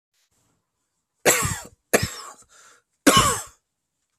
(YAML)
three_cough_length: 4.2 s
three_cough_amplitude: 29955
three_cough_signal_mean_std_ratio: 0.33
survey_phase: beta (2021-08-13 to 2022-03-07)
age: 18-44
gender: Male
wearing_mask: 'No'
symptom_cough_any: true
symptom_runny_or_blocked_nose: true
symptom_sore_throat: true
symptom_onset: 8 days
smoker_status: Never smoked
respiratory_condition_asthma: false
respiratory_condition_other: false
recruitment_source: REACT
submission_delay: 3 days
covid_test_result: Negative
covid_test_method: RT-qPCR
influenza_a_test_result: Negative
influenza_b_test_result: Negative